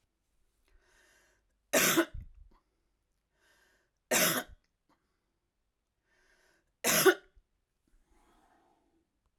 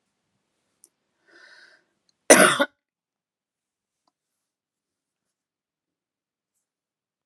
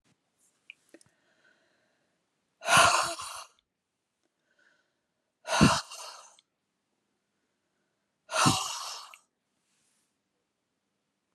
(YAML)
three_cough_length: 9.4 s
three_cough_amplitude: 10895
three_cough_signal_mean_std_ratio: 0.25
cough_length: 7.3 s
cough_amplitude: 32767
cough_signal_mean_std_ratio: 0.15
exhalation_length: 11.3 s
exhalation_amplitude: 14153
exhalation_signal_mean_std_ratio: 0.26
survey_phase: alpha (2021-03-01 to 2021-08-12)
age: 65+
gender: Female
wearing_mask: 'No'
symptom_cough_any: true
symptom_diarrhoea: true
symptom_fatigue: true
symptom_change_to_sense_of_smell_or_taste: true
symptom_loss_of_taste: true
smoker_status: Ex-smoker
respiratory_condition_asthma: false
respiratory_condition_other: false
recruitment_source: Test and Trace
submission_delay: 1 day
covid_test_result: Positive
covid_test_method: RT-qPCR